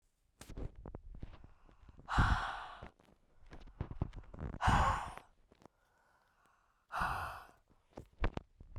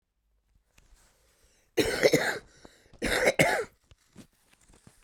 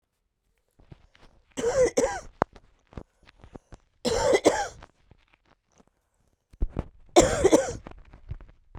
{"exhalation_length": "8.8 s", "exhalation_amplitude": 5270, "exhalation_signal_mean_std_ratio": 0.41, "cough_length": "5.0 s", "cough_amplitude": 16516, "cough_signal_mean_std_ratio": 0.37, "three_cough_length": "8.8 s", "three_cough_amplitude": 25974, "three_cough_signal_mean_std_ratio": 0.35, "survey_phase": "beta (2021-08-13 to 2022-03-07)", "age": "18-44", "gender": "Female", "wearing_mask": "No", "symptom_cough_any": true, "symptom_runny_or_blocked_nose": true, "symptom_fatigue": true, "symptom_fever_high_temperature": true, "symptom_headache": true, "symptom_change_to_sense_of_smell_or_taste": true, "symptom_loss_of_taste": true, "symptom_onset": "3 days", "smoker_status": "Ex-smoker", "respiratory_condition_asthma": false, "respiratory_condition_other": false, "recruitment_source": "Test and Trace", "submission_delay": "2 days", "covid_test_result": "Positive", "covid_test_method": "RT-qPCR", "covid_ct_value": 13.9, "covid_ct_gene": "N gene", "covid_ct_mean": 14.3, "covid_viral_load": "21000000 copies/ml", "covid_viral_load_category": "High viral load (>1M copies/ml)"}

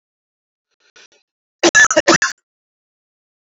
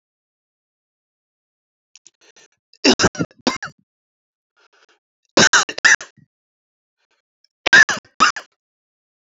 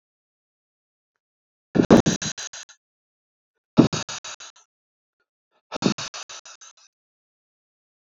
{"cough_length": "3.4 s", "cough_amplitude": 31061, "cough_signal_mean_std_ratio": 0.29, "three_cough_length": "9.4 s", "three_cough_amplitude": 30491, "three_cough_signal_mean_std_ratio": 0.25, "exhalation_length": "8.0 s", "exhalation_amplitude": 31809, "exhalation_signal_mean_std_ratio": 0.22, "survey_phase": "beta (2021-08-13 to 2022-03-07)", "age": "45-64", "gender": "Male", "wearing_mask": "No", "symptom_cough_any": true, "symptom_runny_or_blocked_nose": true, "symptom_sore_throat": true, "symptom_fever_high_temperature": true, "symptom_loss_of_taste": true, "smoker_status": "Never smoked", "respiratory_condition_asthma": false, "respiratory_condition_other": false, "recruitment_source": "Test and Trace", "submission_delay": "2 days", "covid_test_result": "Positive", "covid_test_method": "LFT"}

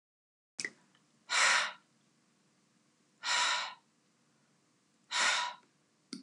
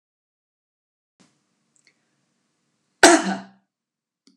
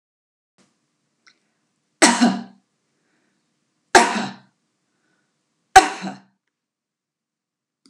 {"exhalation_length": "6.2 s", "exhalation_amplitude": 5721, "exhalation_signal_mean_std_ratio": 0.38, "cough_length": "4.4 s", "cough_amplitude": 32768, "cough_signal_mean_std_ratio": 0.18, "three_cough_length": "7.9 s", "three_cough_amplitude": 32768, "three_cough_signal_mean_std_ratio": 0.22, "survey_phase": "beta (2021-08-13 to 2022-03-07)", "age": "65+", "gender": "Female", "wearing_mask": "No", "symptom_none": true, "smoker_status": "Ex-smoker", "respiratory_condition_asthma": false, "respiratory_condition_other": false, "recruitment_source": "REACT", "submission_delay": "1 day", "covid_test_result": "Negative", "covid_test_method": "RT-qPCR"}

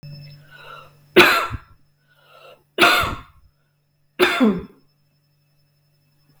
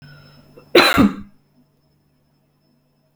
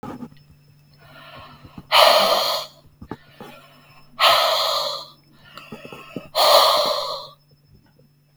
{"three_cough_length": "6.4 s", "three_cough_amplitude": 32768, "three_cough_signal_mean_std_ratio": 0.33, "cough_length": "3.2 s", "cough_amplitude": 32768, "cough_signal_mean_std_ratio": 0.29, "exhalation_length": "8.4 s", "exhalation_amplitude": 32535, "exhalation_signal_mean_std_ratio": 0.46, "survey_phase": "beta (2021-08-13 to 2022-03-07)", "age": "45-64", "gender": "Female", "wearing_mask": "No", "symptom_none": true, "smoker_status": "Never smoked", "respiratory_condition_asthma": false, "respiratory_condition_other": false, "recruitment_source": "REACT", "submission_delay": "1 day", "covid_test_result": "Negative", "covid_test_method": "RT-qPCR", "influenza_a_test_result": "Unknown/Void", "influenza_b_test_result": "Unknown/Void"}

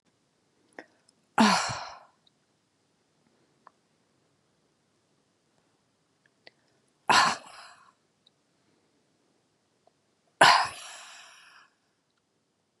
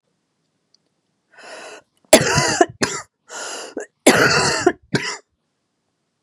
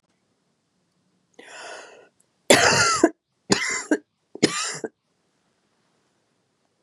{"exhalation_length": "12.8 s", "exhalation_amplitude": 21622, "exhalation_signal_mean_std_ratio": 0.21, "cough_length": "6.2 s", "cough_amplitude": 32768, "cough_signal_mean_std_ratio": 0.38, "three_cough_length": "6.8 s", "three_cough_amplitude": 32658, "three_cough_signal_mean_std_ratio": 0.31, "survey_phase": "beta (2021-08-13 to 2022-03-07)", "age": "45-64", "gender": "Female", "wearing_mask": "Yes", "symptom_cough_any": true, "symptom_runny_or_blocked_nose": true, "symptom_shortness_of_breath": true, "symptom_abdominal_pain": true, "symptom_fatigue": true, "symptom_onset": "4 days", "smoker_status": "Never smoked", "respiratory_condition_asthma": false, "respiratory_condition_other": false, "recruitment_source": "Test and Trace", "submission_delay": "2 days", "covid_test_result": "Positive", "covid_test_method": "RT-qPCR", "covid_ct_value": 31.1, "covid_ct_gene": "ORF1ab gene"}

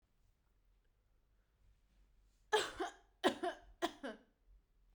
{"three_cough_length": "4.9 s", "three_cough_amplitude": 4382, "three_cough_signal_mean_std_ratio": 0.29, "survey_phase": "beta (2021-08-13 to 2022-03-07)", "age": "18-44", "gender": "Female", "wearing_mask": "Yes", "symptom_none": true, "smoker_status": "Current smoker (1 to 10 cigarettes per day)", "respiratory_condition_asthma": false, "respiratory_condition_other": false, "recruitment_source": "REACT", "submission_delay": "1 day", "covid_test_result": "Negative", "covid_test_method": "RT-qPCR", "influenza_a_test_result": "Negative", "influenza_b_test_result": "Negative"}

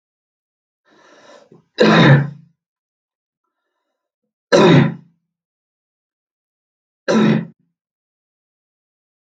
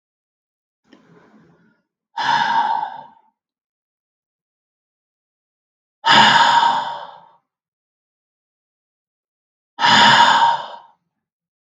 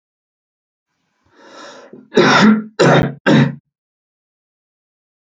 {"three_cough_length": "9.4 s", "three_cough_amplitude": 32768, "three_cough_signal_mean_std_ratio": 0.3, "exhalation_length": "11.8 s", "exhalation_amplitude": 32603, "exhalation_signal_mean_std_ratio": 0.37, "cough_length": "5.2 s", "cough_amplitude": 32768, "cough_signal_mean_std_ratio": 0.38, "survey_phase": "beta (2021-08-13 to 2022-03-07)", "age": "18-44", "gender": "Male", "wearing_mask": "No", "symptom_none": true, "smoker_status": "Never smoked", "respiratory_condition_asthma": false, "respiratory_condition_other": false, "recruitment_source": "REACT", "submission_delay": "3 days", "covid_test_result": "Negative", "covid_test_method": "RT-qPCR", "influenza_a_test_result": "Negative", "influenza_b_test_result": "Negative"}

